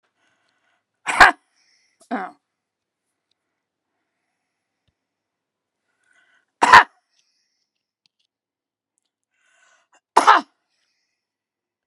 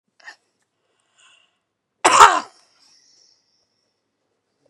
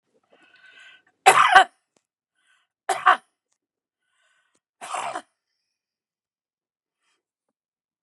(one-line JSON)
{"exhalation_length": "11.9 s", "exhalation_amplitude": 32768, "exhalation_signal_mean_std_ratio": 0.17, "cough_length": "4.7 s", "cough_amplitude": 32768, "cough_signal_mean_std_ratio": 0.2, "three_cough_length": "8.0 s", "three_cough_amplitude": 32768, "three_cough_signal_mean_std_ratio": 0.21, "survey_phase": "beta (2021-08-13 to 2022-03-07)", "age": "65+", "gender": "Female", "wearing_mask": "No", "symptom_cough_any": true, "smoker_status": "Never smoked", "respiratory_condition_asthma": false, "respiratory_condition_other": false, "recruitment_source": "REACT", "submission_delay": "5 days", "covid_test_result": "Negative", "covid_test_method": "RT-qPCR", "influenza_a_test_result": "Negative", "influenza_b_test_result": "Negative"}